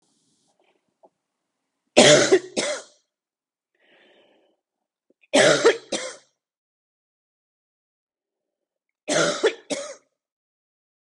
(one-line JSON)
{"three_cough_length": "11.0 s", "three_cough_amplitude": 32767, "three_cough_signal_mean_std_ratio": 0.28, "survey_phase": "beta (2021-08-13 to 2022-03-07)", "age": "18-44", "gender": "Female", "wearing_mask": "No", "symptom_cough_any": true, "symptom_fever_high_temperature": true, "symptom_headache": true, "symptom_change_to_sense_of_smell_or_taste": true, "smoker_status": "Ex-smoker", "respiratory_condition_asthma": false, "respiratory_condition_other": false, "recruitment_source": "Test and Trace", "submission_delay": "2 days", "covid_test_result": "Positive", "covid_test_method": "RT-qPCR"}